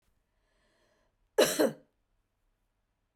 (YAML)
cough_length: 3.2 s
cough_amplitude: 10555
cough_signal_mean_std_ratio: 0.24
survey_phase: beta (2021-08-13 to 2022-03-07)
age: 18-44
gender: Female
wearing_mask: 'No'
symptom_none: true
smoker_status: Never smoked
respiratory_condition_asthma: false
respiratory_condition_other: false
recruitment_source: REACT
submission_delay: 2 days
covid_test_result: Negative
covid_test_method: RT-qPCR